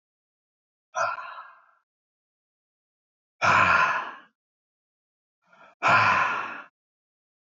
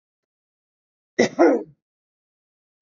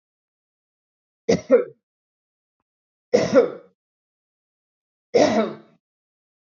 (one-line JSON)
{"exhalation_length": "7.6 s", "exhalation_amplitude": 14458, "exhalation_signal_mean_std_ratio": 0.37, "cough_length": "2.8 s", "cough_amplitude": 26653, "cough_signal_mean_std_ratio": 0.26, "three_cough_length": "6.5 s", "three_cough_amplitude": 21683, "three_cough_signal_mean_std_ratio": 0.29, "survey_phase": "beta (2021-08-13 to 2022-03-07)", "age": "45-64", "gender": "Male", "wearing_mask": "No", "symptom_none": true, "smoker_status": "Ex-smoker", "respiratory_condition_asthma": false, "respiratory_condition_other": false, "recruitment_source": "REACT", "submission_delay": "0 days", "covid_test_result": "Negative", "covid_test_method": "RT-qPCR", "influenza_a_test_result": "Negative", "influenza_b_test_result": "Negative"}